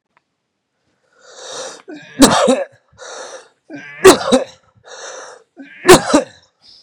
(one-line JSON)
{"three_cough_length": "6.8 s", "three_cough_amplitude": 32768, "three_cough_signal_mean_std_ratio": 0.34, "survey_phase": "beta (2021-08-13 to 2022-03-07)", "age": "45-64", "gender": "Male", "wearing_mask": "No", "symptom_none": true, "smoker_status": "Never smoked", "respiratory_condition_asthma": false, "respiratory_condition_other": false, "recruitment_source": "REACT", "submission_delay": "2 days", "covid_test_result": "Negative", "covid_test_method": "RT-qPCR", "influenza_a_test_result": "Negative", "influenza_b_test_result": "Negative"}